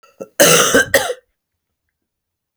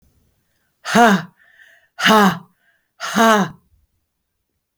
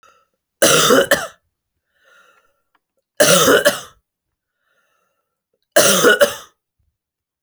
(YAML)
cough_length: 2.6 s
cough_amplitude: 32768
cough_signal_mean_std_ratio: 0.4
exhalation_length: 4.8 s
exhalation_amplitude: 32767
exhalation_signal_mean_std_ratio: 0.38
three_cough_length: 7.4 s
three_cough_amplitude: 32768
three_cough_signal_mean_std_ratio: 0.38
survey_phase: beta (2021-08-13 to 2022-03-07)
age: 45-64
gender: Female
wearing_mask: 'No'
symptom_cough_any: true
symptom_headache: true
symptom_other: true
smoker_status: Never smoked
respiratory_condition_asthma: false
respiratory_condition_other: false
recruitment_source: Test and Trace
submission_delay: 0 days
covid_test_result: Negative
covid_test_method: LFT